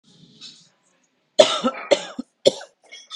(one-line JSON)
{"three_cough_length": "3.2 s", "three_cough_amplitude": 32768, "three_cough_signal_mean_std_ratio": 0.28, "survey_phase": "beta (2021-08-13 to 2022-03-07)", "age": "45-64", "gender": "Female", "wearing_mask": "No", "symptom_none": true, "smoker_status": "Current smoker (1 to 10 cigarettes per day)", "respiratory_condition_asthma": false, "respiratory_condition_other": false, "recruitment_source": "REACT", "submission_delay": "1 day", "covid_test_result": "Negative", "covid_test_method": "RT-qPCR", "influenza_a_test_result": "Negative", "influenza_b_test_result": "Negative"}